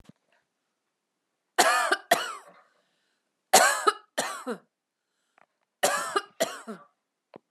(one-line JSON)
{"three_cough_length": "7.5 s", "three_cough_amplitude": 23680, "three_cough_signal_mean_std_ratio": 0.34, "survey_phase": "beta (2021-08-13 to 2022-03-07)", "age": "45-64", "gender": "Female", "wearing_mask": "No", "symptom_runny_or_blocked_nose": true, "symptom_fatigue": true, "smoker_status": "Never smoked", "respiratory_condition_asthma": false, "respiratory_condition_other": false, "recruitment_source": "REACT", "submission_delay": "1 day", "covid_test_result": "Negative", "covid_test_method": "RT-qPCR", "influenza_a_test_result": "Negative", "influenza_b_test_result": "Negative"}